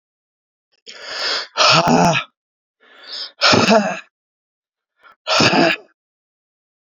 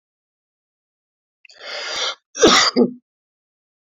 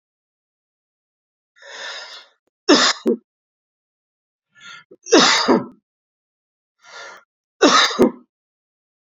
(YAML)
exhalation_length: 7.0 s
exhalation_amplitude: 32768
exhalation_signal_mean_std_ratio: 0.44
cough_length: 3.9 s
cough_amplitude: 30518
cough_signal_mean_std_ratio: 0.33
three_cough_length: 9.1 s
three_cough_amplitude: 29241
three_cough_signal_mean_std_ratio: 0.31
survey_phase: beta (2021-08-13 to 2022-03-07)
age: 45-64
gender: Male
wearing_mask: 'No'
symptom_none: true
smoker_status: Never smoked
respiratory_condition_asthma: false
respiratory_condition_other: false
recruitment_source: REACT
submission_delay: 2 days
covid_test_result: Negative
covid_test_method: RT-qPCR